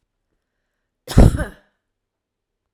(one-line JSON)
{"cough_length": "2.7 s", "cough_amplitude": 32768, "cough_signal_mean_std_ratio": 0.22, "survey_phase": "alpha (2021-03-01 to 2021-08-12)", "age": "45-64", "gender": "Female", "wearing_mask": "No", "symptom_none": true, "smoker_status": "Never smoked", "respiratory_condition_asthma": false, "respiratory_condition_other": false, "recruitment_source": "REACT", "submission_delay": "2 days", "covid_test_result": "Negative", "covid_test_method": "RT-qPCR"}